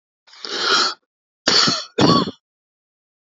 {"cough_length": "3.3 s", "cough_amplitude": 29040, "cough_signal_mean_std_ratio": 0.47, "survey_phase": "alpha (2021-03-01 to 2021-08-12)", "age": "45-64", "gender": "Male", "wearing_mask": "No", "symptom_none": true, "smoker_status": "Current smoker (11 or more cigarettes per day)", "respiratory_condition_asthma": false, "respiratory_condition_other": false, "recruitment_source": "REACT", "submission_delay": "2 days", "covid_test_result": "Negative", "covid_test_method": "RT-qPCR"}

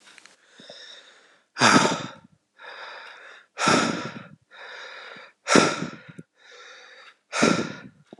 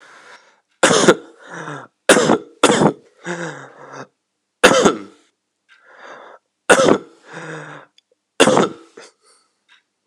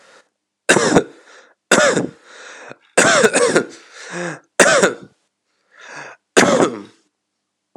{"exhalation_length": "8.2 s", "exhalation_amplitude": 30563, "exhalation_signal_mean_std_ratio": 0.38, "three_cough_length": "10.1 s", "three_cough_amplitude": 32768, "three_cough_signal_mean_std_ratio": 0.37, "cough_length": "7.8 s", "cough_amplitude": 32768, "cough_signal_mean_std_ratio": 0.44, "survey_phase": "alpha (2021-03-01 to 2021-08-12)", "age": "18-44", "gender": "Male", "wearing_mask": "No", "symptom_abdominal_pain": true, "symptom_fatigue": true, "symptom_fever_high_temperature": true, "symptom_headache": true, "symptom_loss_of_taste": true, "symptom_onset": "9 days", "smoker_status": "Current smoker (e-cigarettes or vapes only)", "respiratory_condition_asthma": false, "respiratory_condition_other": false, "recruitment_source": "Test and Trace", "submission_delay": "2 days", "covid_test_result": "Positive", "covid_test_method": "RT-qPCR", "covid_ct_value": 17.2, "covid_ct_gene": "ORF1ab gene", "covid_ct_mean": 17.4, "covid_viral_load": "2000000 copies/ml", "covid_viral_load_category": "High viral load (>1M copies/ml)"}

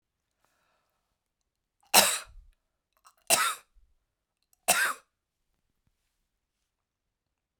{"three_cough_length": "7.6 s", "three_cough_amplitude": 20398, "three_cough_signal_mean_std_ratio": 0.23, "survey_phase": "beta (2021-08-13 to 2022-03-07)", "age": "65+", "gender": "Female", "wearing_mask": "No", "symptom_none": true, "smoker_status": "Never smoked", "respiratory_condition_asthma": false, "respiratory_condition_other": false, "recruitment_source": "Test and Trace", "submission_delay": "2 days", "covid_test_result": "Negative", "covid_test_method": "LFT"}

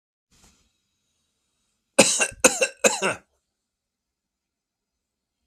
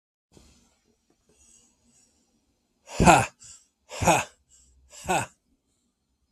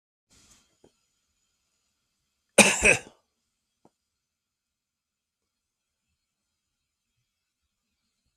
{"three_cough_length": "5.5 s", "three_cough_amplitude": 32768, "three_cough_signal_mean_std_ratio": 0.25, "exhalation_length": "6.3 s", "exhalation_amplitude": 32766, "exhalation_signal_mean_std_ratio": 0.25, "cough_length": "8.4 s", "cough_amplitude": 32596, "cough_signal_mean_std_ratio": 0.15, "survey_phase": "beta (2021-08-13 to 2022-03-07)", "age": "45-64", "gender": "Male", "wearing_mask": "No", "symptom_none": true, "smoker_status": "Never smoked", "respiratory_condition_asthma": false, "respiratory_condition_other": false, "recruitment_source": "REACT", "submission_delay": "3 days", "covid_test_result": "Negative", "covid_test_method": "RT-qPCR", "influenza_a_test_result": "Negative", "influenza_b_test_result": "Negative"}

